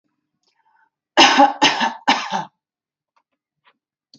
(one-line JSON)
{"three_cough_length": "4.2 s", "three_cough_amplitude": 31144, "three_cough_signal_mean_std_ratio": 0.34, "survey_phase": "beta (2021-08-13 to 2022-03-07)", "age": "18-44", "gender": "Female", "wearing_mask": "No", "symptom_none": true, "smoker_status": "Never smoked", "respiratory_condition_asthma": false, "respiratory_condition_other": false, "recruitment_source": "Test and Trace", "submission_delay": "1 day", "covid_test_result": "Positive", "covid_test_method": "RT-qPCR", "covid_ct_value": 28.2, "covid_ct_gene": "S gene", "covid_ct_mean": 28.4, "covid_viral_load": "480 copies/ml", "covid_viral_load_category": "Minimal viral load (< 10K copies/ml)"}